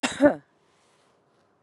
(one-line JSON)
{"cough_length": "1.6 s", "cough_amplitude": 21691, "cough_signal_mean_std_ratio": 0.27, "survey_phase": "beta (2021-08-13 to 2022-03-07)", "age": "45-64", "gender": "Female", "wearing_mask": "No", "symptom_none": true, "smoker_status": "Never smoked", "respiratory_condition_asthma": false, "respiratory_condition_other": false, "recruitment_source": "REACT", "submission_delay": "3 days", "covid_test_result": "Negative", "covid_test_method": "RT-qPCR", "influenza_a_test_result": "Negative", "influenza_b_test_result": "Negative"}